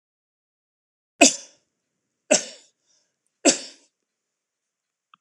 {"three_cough_length": "5.2 s", "three_cough_amplitude": 26028, "three_cough_signal_mean_std_ratio": 0.19, "survey_phase": "alpha (2021-03-01 to 2021-08-12)", "age": "65+", "gender": "Male", "wearing_mask": "No", "symptom_none": true, "smoker_status": "Never smoked", "respiratory_condition_asthma": false, "respiratory_condition_other": false, "recruitment_source": "REACT", "submission_delay": "2 days", "covid_test_result": "Negative", "covid_test_method": "RT-qPCR"}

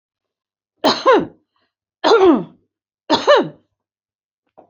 {"three_cough_length": "4.7 s", "three_cough_amplitude": 27836, "three_cough_signal_mean_std_ratio": 0.39, "survey_phase": "beta (2021-08-13 to 2022-03-07)", "age": "65+", "gender": "Female", "wearing_mask": "No", "symptom_none": true, "smoker_status": "Never smoked", "respiratory_condition_asthma": false, "respiratory_condition_other": false, "recruitment_source": "REACT", "submission_delay": "1 day", "covid_test_result": "Negative", "covid_test_method": "RT-qPCR", "influenza_a_test_result": "Unknown/Void", "influenza_b_test_result": "Unknown/Void"}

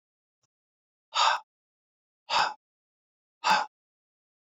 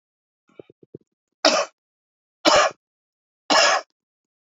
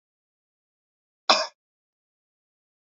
{"exhalation_length": "4.5 s", "exhalation_amplitude": 9367, "exhalation_signal_mean_std_ratio": 0.3, "three_cough_length": "4.4 s", "three_cough_amplitude": 32767, "three_cough_signal_mean_std_ratio": 0.33, "cough_length": "2.8 s", "cough_amplitude": 20390, "cough_signal_mean_std_ratio": 0.16, "survey_phase": "beta (2021-08-13 to 2022-03-07)", "age": "45-64", "gender": "Male", "wearing_mask": "No", "symptom_cough_any": true, "symptom_runny_or_blocked_nose": true, "smoker_status": "Never smoked", "respiratory_condition_asthma": false, "respiratory_condition_other": false, "recruitment_source": "Test and Trace", "submission_delay": "2 days", "covid_test_result": "Positive", "covid_test_method": "RT-qPCR", "covid_ct_value": 26.7, "covid_ct_gene": "ORF1ab gene"}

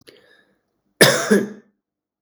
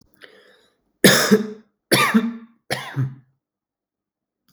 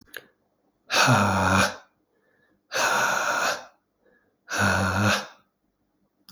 {"cough_length": "2.2 s", "cough_amplitude": 32768, "cough_signal_mean_std_ratio": 0.33, "three_cough_length": "4.5 s", "three_cough_amplitude": 32768, "three_cough_signal_mean_std_ratio": 0.37, "exhalation_length": "6.3 s", "exhalation_amplitude": 18576, "exhalation_signal_mean_std_ratio": 0.54, "survey_phase": "beta (2021-08-13 to 2022-03-07)", "age": "45-64", "gender": "Male", "wearing_mask": "No", "symptom_cough_any": true, "symptom_runny_or_blocked_nose": true, "symptom_onset": "3 days", "smoker_status": "Ex-smoker", "respiratory_condition_asthma": false, "respiratory_condition_other": false, "recruitment_source": "Test and Trace", "submission_delay": "1 day", "covid_test_result": "Negative", "covid_test_method": "ePCR"}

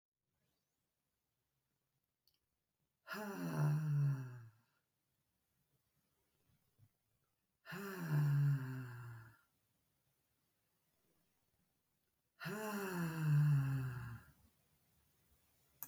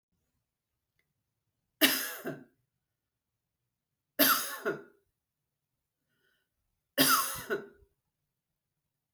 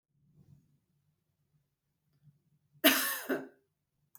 {"exhalation_length": "15.9 s", "exhalation_amplitude": 1530, "exhalation_signal_mean_std_ratio": 0.43, "three_cough_length": "9.1 s", "three_cough_amplitude": 13304, "three_cough_signal_mean_std_ratio": 0.28, "cough_length": "4.2 s", "cough_amplitude": 11005, "cough_signal_mean_std_ratio": 0.24, "survey_phase": "beta (2021-08-13 to 2022-03-07)", "age": "45-64", "gender": "Female", "wearing_mask": "No", "symptom_none": true, "smoker_status": "Never smoked", "respiratory_condition_asthma": false, "respiratory_condition_other": false, "recruitment_source": "REACT", "submission_delay": "0 days", "covid_test_result": "Negative", "covid_test_method": "RT-qPCR", "influenza_a_test_result": "Negative", "influenza_b_test_result": "Negative"}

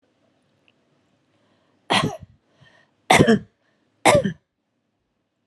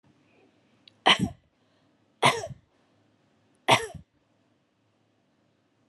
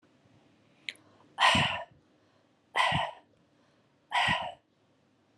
{"three_cough_length": "5.5 s", "three_cough_amplitude": 32639, "three_cough_signal_mean_std_ratio": 0.28, "cough_length": "5.9 s", "cough_amplitude": 20579, "cough_signal_mean_std_ratio": 0.23, "exhalation_length": "5.4 s", "exhalation_amplitude": 11444, "exhalation_signal_mean_std_ratio": 0.38, "survey_phase": "alpha (2021-03-01 to 2021-08-12)", "age": "45-64", "gender": "Female", "wearing_mask": "No", "symptom_none": true, "smoker_status": "Never smoked", "respiratory_condition_asthma": false, "respiratory_condition_other": false, "recruitment_source": "REACT", "submission_delay": "5 days", "covid_test_result": "Negative", "covid_test_method": "RT-qPCR"}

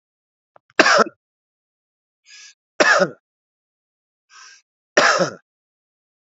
{"cough_length": "6.3 s", "cough_amplitude": 32768, "cough_signal_mean_std_ratio": 0.29, "survey_phase": "beta (2021-08-13 to 2022-03-07)", "age": "45-64", "gender": "Male", "wearing_mask": "No", "symptom_runny_or_blocked_nose": true, "symptom_onset": "3 days", "smoker_status": "Current smoker (1 to 10 cigarettes per day)", "respiratory_condition_asthma": false, "respiratory_condition_other": false, "recruitment_source": "Test and Trace", "submission_delay": "0 days", "covid_test_result": "Positive", "covid_test_method": "RT-qPCR"}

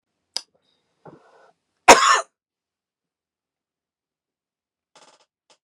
{"cough_length": "5.6 s", "cough_amplitude": 32768, "cough_signal_mean_std_ratio": 0.17, "survey_phase": "beta (2021-08-13 to 2022-03-07)", "age": "45-64", "gender": "Male", "wearing_mask": "No", "symptom_none": true, "smoker_status": "Never smoked", "respiratory_condition_asthma": false, "respiratory_condition_other": false, "recruitment_source": "REACT", "submission_delay": "1 day", "covid_test_result": "Negative", "covid_test_method": "RT-qPCR"}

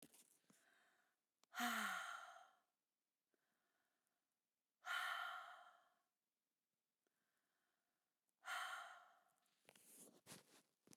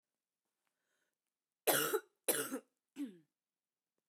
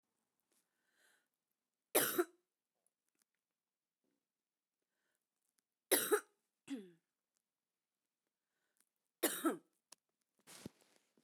{"exhalation_length": "11.0 s", "exhalation_amplitude": 868, "exhalation_signal_mean_std_ratio": 0.36, "cough_length": "4.1 s", "cough_amplitude": 5314, "cough_signal_mean_std_ratio": 0.31, "three_cough_length": "11.2 s", "three_cough_amplitude": 3984, "three_cough_signal_mean_std_ratio": 0.21, "survey_phase": "beta (2021-08-13 to 2022-03-07)", "age": "45-64", "gender": "Female", "wearing_mask": "No", "symptom_cough_any": true, "symptom_new_continuous_cough": true, "symptom_runny_or_blocked_nose": true, "symptom_fatigue": true, "symptom_headache": true, "symptom_other": true, "symptom_onset": "3 days", "smoker_status": "Current smoker (1 to 10 cigarettes per day)", "respiratory_condition_asthma": false, "respiratory_condition_other": false, "recruitment_source": "Test and Trace", "submission_delay": "1 day", "covid_test_result": "Positive", "covid_test_method": "RT-qPCR"}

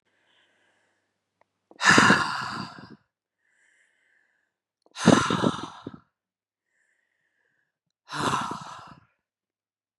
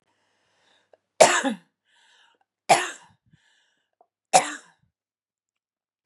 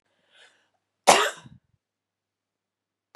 {"exhalation_length": "10.0 s", "exhalation_amplitude": 25087, "exhalation_signal_mean_std_ratio": 0.29, "three_cough_length": "6.1 s", "three_cough_amplitude": 32049, "three_cough_signal_mean_std_ratio": 0.22, "cough_length": "3.2 s", "cough_amplitude": 32765, "cough_signal_mean_std_ratio": 0.19, "survey_phase": "beta (2021-08-13 to 2022-03-07)", "age": "45-64", "gender": "Female", "wearing_mask": "No", "symptom_sore_throat": true, "smoker_status": "Ex-smoker", "respiratory_condition_asthma": false, "respiratory_condition_other": false, "recruitment_source": "Test and Trace", "submission_delay": "0 days", "covid_test_result": "Positive", "covid_test_method": "LFT"}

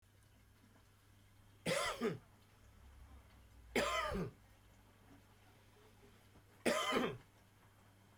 {"three_cough_length": "8.2 s", "three_cough_amplitude": 2954, "three_cough_signal_mean_std_ratio": 0.42, "survey_phase": "beta (2021-08-13 to 2022-03-07)", "age": "65+", "gender": "Male", "wearing_mask": "No", "symptom_cough_any": true, "symptom_onset": "8 days", "smoker_status": "Never smoked", "respiratory_condition_asthma": false, "respiratory_condition_other": false, "recruitment_source": "REACT", "submission_delay": "2 days", "covid_test_result": "Negative", "covid_test_method": "RT-qPCR", "influenza_a_test_result": "Unknown/Void", "influenza_b_test_result": "Unknown/Void"}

